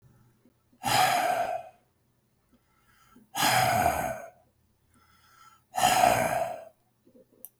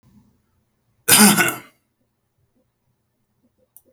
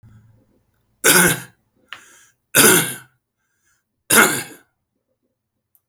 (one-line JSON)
{"exhalation_length": "7.6 s", "exhalation_amplitude": 13693, "exhalation_signal_mean_std_ratio": 0.48, "cough_length": "3.9 s", "cough_amplitude": 32768, "cough_signal_mean_std_ratio": 0.26, "three_cough_length": "5.9 s", "three_cough_amplitude": 32768, "three_cough_signal_mean_std_ratio": 0.33, "survey_phase": "beta (2021-08-13 to 2022-03-07)", "age": "65+", "gender": "Male", "wearing_mask": "No", "symptom_none": true, "smoker_status": "Ex-smoker", "respiratory_condition_asthma": false, "respiratory_condition_other": false, "recruitment_source": "REACT", "submission_delay": "0 days", "covid_test_result": "Negative", "covid_test_method": "RT-qPCR", "influenza_a_test_result": "Negative", "influenza_b_test_result": "Negative"}